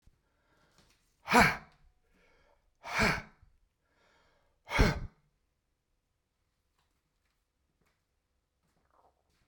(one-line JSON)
{"exhalation_length": "9.5 s", "exhalation_amplitude": 11849, "exhalation_signal_mean_std_ratio": 0.22, "survey_phase": "beta (2021-08-13 to 2022-03-07)", "age": "65+", "gender": "Male", "wearing_mask": "No", "symptom_cough_any": true, "symptom_runny_or_blocked_nose": true, "symptom_headache": true, "smoker_status": "Ex-smoker", "respiratory_condition_asthma": false, "respiratory_condition_other": false, "recruitment_source": "Test and Trace", "submission_delay": "1 day", "covid_test_result": "Positive", "covid_test_method": "RT-qPCR", "covid_ct_value": 30.3, "covid_ct_gene": "ORF1ab gene", "covid_ct_mean": 31.7, "covid_viral_load": "39 copies/ml", "covid_viral_load_category": "Minimal viral load (< 10K copies/ml)"}